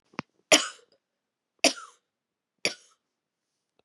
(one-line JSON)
{"three_cough_length": "3.8 s", "three_cough_amplitude": 21453, "three_cough_signal_mean_std_ratio": 0.19, "survey_phase": "beta (2021-08-13 to 2022-03-07)", "age": "45-64", "gender": "Female", "wearing_mask": "No", "symptom_cough_any": true, "symptom_runny_or_blocked_nose": true, "symptom_sore_throat": true, "symptom_headache": true, "symptom_onset": "3 days", "smoker_status": "Ex-smoker", "respiratory_condition_asthma": false, "respiratory_condition_other": false, "recruitment_source": "Test and Trace", "submission_delay": "1 day", "covid_test_result": "Positive", "covid_test_method": "RT-qPCR", "covid_ct_value": 31.1, "covid_ct_gene": "ORF1ab gene"}